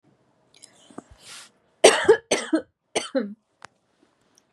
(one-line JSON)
{"three_cough_length": "4.5 s", "three_cough_amplitude": 32755, "three_cough_signal_mean_std_ratio": 0.28, "survey_phase": "beta (2021-08-13 to 2022-03-07)", "age": "18-44", "gender": "Female", "wearing_mask": "No", "symptom_none": true, "smoker_status": "Never smoked", "respiratory_condition_asthma": false, "respiratory_condition_other": false, "recruitment_source": "REACT", "submission_delay": "1 day", "covid_test_result": "Negative", "covid_test_method": "RT-qPCR", "influenza_a_test_result": "Negative", "influenza_b_test_result": "Negative"}